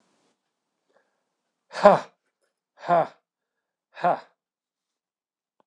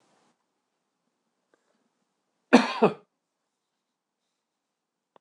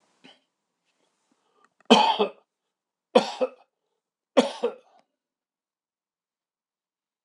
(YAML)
exhalation_length: 5.7 s
exhalation_amplitude: 26028
exhalation_signal_mean_std_ratio: 0.21
cough_length: 5.2 s
cough_amplitude: 25186
cough_signal_mean_std_ratio: 0.16
three_cough_length: 7.2 s
three_cough_amplitude: 25801
three_cough_signal_mean_std_ratio: 0.23
survey_phase: beta (2021-08-13 to 2022-03-07)
age: 65+
gender: Male
wearing_mask: 'No'
symptom_none: true
smoker_status: Ex-smoker
respiratory_condition_asthma: false
respiratory_condition_other: false
recruitment_source: REACT
submission_delay: 2 days
covid_test_result: Negative
covid_test_method: RT-qPCR